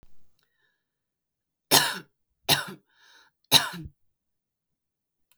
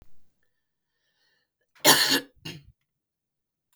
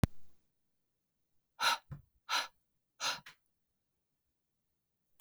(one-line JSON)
{"three_cough_length": "5.4 s", "three_cough_amplitude": 29210, "three_cough_signal_mean_std_ratio": 0.24, "cough_length": "3.8 s", "cough_amplitude": 23368, "cough_signal_mean_std_ratio": 0.25, "exhalation_length": "5.2 s", "exhalation_amplitude": 7897, "exhalation_signal_mean_std_ratio": 0.28, "survey_phase": "beta (2021-08-13 to 2022-03-07)", "age": "18-44", "gender": "Female", "wearing_mask": "No", "symptom_none": true, "symptom_onset": "6 days", "smoker_status": "Never smoked", "respiratory_condition_asthma": false, "respiratory_condition_other": false, "recruitment_source": "REACT", "submission_delay": "2 days", "covid_test_result": "Negative", "covid_test_method": "RT-qPCR", "influenza_a_test_result": "Negative", "influenza_b_test_result": "Negative"}